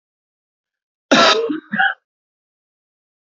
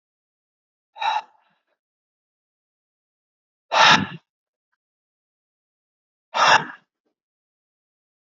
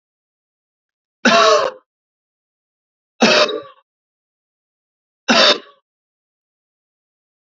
{"cough_length": "3.2 s", "cough_amplitude": 29248, "cough_signal_mean_std_ratio": 0.35, "exhalation_length": "8.3 s", "exhalation_amplitude": 26743, "exhalation_signal_mean_std_ratio": 0.23, "three_cough_length": "7.4 s", "three_cough_amplitude": 31723, "three_cough_signal_mean_std_ratio": 0.31, "survey_phase": "beta (2021-08-13 to 2022-03-07)", "age": "18-44", "gender": "Male", "wearing_mask": "No", "symptom_runny_or_blocked_nose": true, "smoker_status": "Never smoked", "respiratory_condition_asthma": true, "respiratory_condition_other": false, "recruitment_source": "REACT", "submission_delay": "2 days", "covid_test_result": "Negative", "covid_test_method": "RT-qPCR", "influenza_a_test_result": "Negative", "influenza_b_test_result": "Negative"}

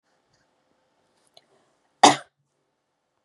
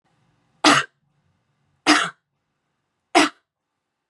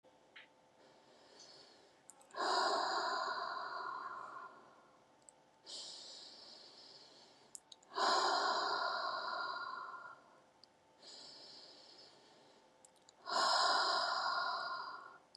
{"cough_length": "3.2 s", "cough_amplitude": 30802, "cough_signal_mean_std_ratio": 0.14, "three_cough_length": "4.1 s", "three_cough_amplitude": 31804, "three_cough_signal_mean_std_ratio": 0.28, "exhalation_length": "15.4 s", "exhalation_amplitude": 2860, "exhalation_signal_mean_std_ratio": 0.56, "survey_phase": "beta (2021-08-13 to 2022-03-07)", "age": "18-44", "gender": "Female", "wearing_mask": "No", "symptom_none": true, "smoker_status": "Never smoked", "respiratory_condition_asthma": false, "respiratory_condition_other": false, "recruitment_source": "REACT", "submission_delay": "1 day", "covid_test_result": "Negative", "covid_test_method": "RT-qPCR", "influenza_a_test_result": "Negative", "influenza_b_test_result": "Negative"}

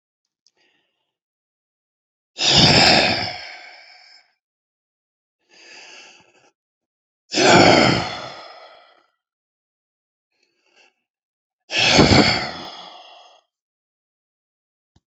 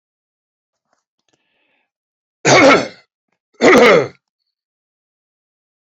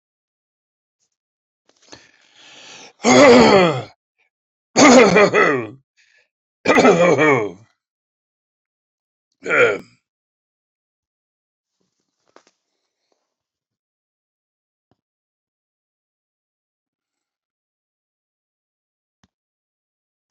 {"exhalation_length": "15.1 s", "exhalation_amplitude": 30499, "exhalation_signal_mean_std_ratio": 0.33, "cough_length": "5.9 s", "cough_amplitude": 29411, "cough_signal_mean_std_ratio": 0.32, "three_cough_length": "20.3 s", "three_cough_amplitude": 31296, "three_cough_signal_mean_std_ratio": 0.29, "survey_phase": "beta (2021-08-13 to 2022-03-07)", "age": "65+", "gender": "Male", "wearing_mask": "No", "symptom_none": true, "smoker_status": "Never smoked", "respiratory_condition_asthma": false, "respiratory_condition_other": false, "recruitment_source": "REACT", "submission_delay": "3 days", "covid_test_result": "Negative", "covid_test_method": "RT-qPCR", "influenza_a_test_result": "Negative", "influenza_b_test_result": "Negative"}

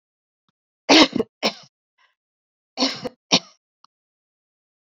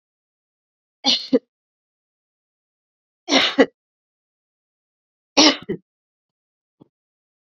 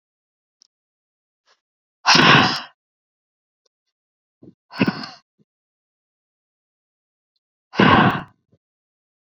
{"cough_length": "4.9 s", "cough_amplitude": 31157, "cough_signal_mean_std_ratio": 0.24, "three_cough_length": "7.5 s", "three_cough_amplitude": 30858, "three_cough_signal_mean_std_ratio": 0.23, "exhalation_length": "9.4 s", "exhalation_amplitude": 32427, "exhalation_signal_mean_std_ratio": 0.26, "survey_phase": "beta (2021-08-13 to 2022-03-07)", "age": "45-64", "gender": "Female", "wearing_mask": "No", "symptom_none": true, "smoker_status": "Never smoked", "respiratory_condition_asthma": false, "respiratory_condition_other": false, "recruitment_source": "REACT", "submission_delay": "1 day", "covid_test_result": "Negative", "covid_test_method": "RT-qPCR"}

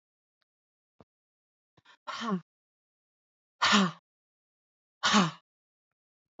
{"exhalation_length": "6.4 s", "exhalation_amplitude": 9960, "exhalation_signal_mean_std_ratio": 0.27, "survey_phase": "beta (2021-08-13 to 2022-03-07)", "age": "45-64", "gender": "Female", "wearing_mask": "No", "symptom_none": true, "smoker_status": "Ex-smoker", "respiratory_condition_asthma": false, "respiratory_condition_other": false, "recruitment_source": "REACT", "submission_delay": "1 day", "covid_test_result": "Negative", "covid_test_method": "RT-qPCR", "influenza_a_test_result": "Unknown/Void", "influenza_b_test_result": "Unknown/Void"}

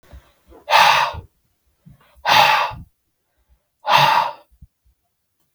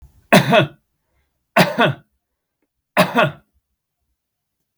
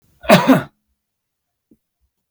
{"exhalation_length": "5.5 s", "exhalation_amplitude": 32768, "exhalation_signal_mean_std_ratio": 0.41, "three_cough_length": "4.8 s", "three_cough_amplitude": 32768, "three_cough_signal_mean_std_ratio": 0.34, "cough_length": "2.3 s", "cough_amplitude": 32768, "cough_signal_mean_std_ratio": 0.29, "survey_phase": "beta (2021-08-13 to 2022-03-07)", "age": "65+", "gender": "Male", "wearing_mask": "No", "symptom_none": true, "smoker_status": "Ex-smoker", "respiratory_condition_asthma": false, "respiratory_condition_other": false, "recruitment_source": "Test and Trace", "submission_delay": "2 days", "covid_test_result": "Positive", "covid_test_method": "RT-qPCR", "covid_ct_value": 28.2, "covid_ct_gene": "ORF1ab gene"}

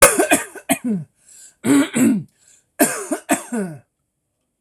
{"cough_length": "4.6 s", "cough_amplitude": 26028, "cough_signal_mean_std_ratio": 0.48, "survey_phase": "beta (2021-08-13 to 2022-03-07)", "age": "45-64", "gender": "Male", "wearing_mask": "No", "symptom_none": true, "smoker_status": "Never smoked", "respiratory_condition_asthma": false, "respiratory_condition_other": false, "recruitment_source": "REACT", "submission_delay": "2 days", "covid_test_result": "Negative", "covid_test_method": "RT-qPCR", "influenza_a_test_result": "Negative", "influenza_b_test_result": "Negative"}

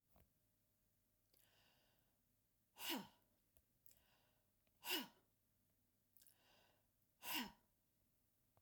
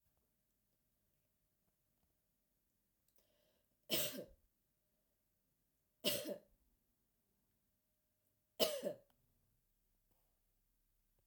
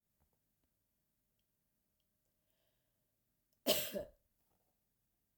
{"exhalation_length": "8.6 s", "exhalation_amplitude": 1091, "exhalation_signal_mean_std_ratio": 0.27, "three_cough_length": "11.3 s", "three_cough_amplitude": 3072, "three_cough_signal_mean_std_ratio": 0.22, "cough_length": "5.4 s", "cough_amplitude": 3647, "cough_signal_mean_std_ratio": 0.19, "survey_phase": "beta (2021-08-13 to 2022-03-07)", "age": "45-64", "gender": "Female", "wearing_mask": "No", "symptom_none": true, "smoker_status": "Never smoked", "respiratory_condition_asthma": false, "respiratory_condition_other": false, "recruitment_source": "REACT", "submission_delay": "2 days", "covid_test_result": "Negative", "covid_test_method": "RT-qPCR"}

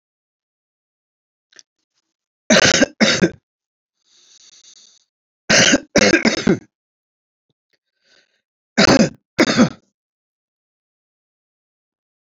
{"three_cough_length": "12.4 s", "three_cough_amplitude": 32113, "three_cough_signal_mean_std_ratio": 0.31, "survey_phase": "beta (2021-08-13 to 2022-03-07)", "age": "65+", "gender": "Male", "wearing_mask": "No", "symptom_cough_any": true, "symptom_runny_or_blocked_nose": true, "symptom_onset": "12 days", "smoker_status": "Never smoked", "respiratory_condition_asthma": false, "respiratory_condition_other": false, "recruitment_source": "REACT", "submission_delay": "1 day", "covid_test_result": "Negative", "covid_test_method": "RT-qPCR", "influenza_a_test_result": "Negative", "influenza_b_test_result": "Negative"}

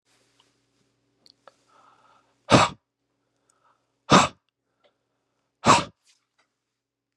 {"exhalation_length": "7.2 s", "exhalation_amplitude": 29251, "exhalation_signal_mean_std_ratio": 0.21, "survey_phase": "beta (2021-08-13 to 2022-03-07)", "age": "18-44", "gender": "Male", "wearing_mask": "No", "symptom_cough_any": true, "symptom_runny_or_blocked_nose": true, "symptom_fatigue": true, "symptom_headache": true, "symptom_change_to_sense_of_smell_or_taste": true, "symptom_onset": "3 days", "smoker_status": "Ex-smoker", "respiratory_condition_asthma": false, "respiratory_condition_other": false, "recruitment_source": "Test and Trace", "submission_delay": "2 days", "covid_test_result": "Positive", "covid_test_method": "RT-qPCR", "covid_ct_value": 23.4, "covid_ct_gene": "ORF1ab gene"}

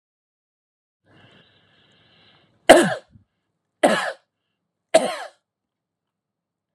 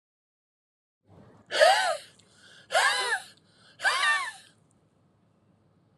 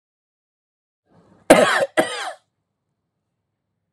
{"three_cough_length": "6.7 s", "three_cough_amplitude": 32768, "three_cough_signal_mean_std_ratio": 0.22, "exhalation_length": "6.0 s", "exhalation_amplitude": 15578, "exhalation_signal_mean_std_ratio": 0.39, "cough_length": "3.9 s", "cough_amplitude": 32768, "cough_signal_mean_std_ratio": 0.27, "survey_phase": "alpha (2021-03-01 to 2021-08-12)", "age": "45-64", "gender": "Male", "wearing_mask": "No", "symptom_none": true, "smoker_status": "Never smoked", "respiratory_condition_asthma": false, "respiratory_condition_other": false, "recruitment_source": "REACT", "submission_delay": "1 day", "covid_test_result": "Negative", "covid_test_method": "RT-qPCR"}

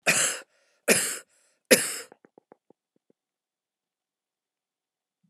{"cough_length": "5.3 s", "cough_amplitude": 23393, "cough_signal_mean_std_ratio": 0.27, "survey_phase": "alpha (2021-03-01 to 2021-08-12)", "age": "45-64", "gender": "Female", "wearing_mask": "No", "symptom_none": true, "smoker_status": "Never smoked", "respiratory_condition_asthma": false, "respiratory_condition_other": false, "recruitment_source": "REACT", "submission_delay": "9 days", "covid_test_result": "Negative", "covid_test_method": "RT-qPCR"}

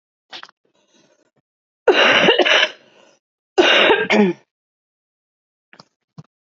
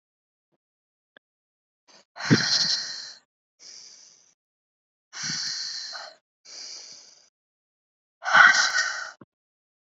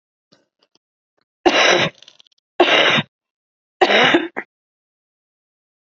{"cough_length": "6.6 s", "cough_amplitude": 29854, "cough_signal_mean_std_ratio": 0.4, "exhalation_length": "9.8 s", "exhalation_amplitude": 26400, "exhalation_signal_mean_std_ratio": 0.32, "three_cough_length": "5.9 s", "three_cough_amplitude": 32767, "three_cough_signal_mean_std_ratio": 0.38, "survey_phase": "beta (2021-08-13 to 2022-03-07)", "age": "18-44", "gender": "Female", "wearing_mask": "No", "symptom_cough_any": true, "symptom_new_continuous_cough": true, "symptom_runny_or_blocked_nose": true, "symptom_sore_throat": true, "symptom_fatigue": true, "symptom_fever_high_temperature": true, "symptom_headache": true, "symptom_change_to_sense_of_smell_or_taste": true, "symptom_onset": "6 days", "smoker_status": "Ex-smoker", "respiratory_condition_asthma": false, "respiratory_condition_other": false, "recruitment_source": "Test and Trace", "submission_delay": "2 days", "covid_test_result": "Positive", "covid_test_method": "RT-qPCR", "covid_ct_value": 21.4, "covid_ct_gene": "ORF1ab gene", "covid_ct_mean": 21.7, "covid_viral_load": "75000 copies/ml", "covid_viral_load_category": "Low viral load (10K-1M copies/ml)"}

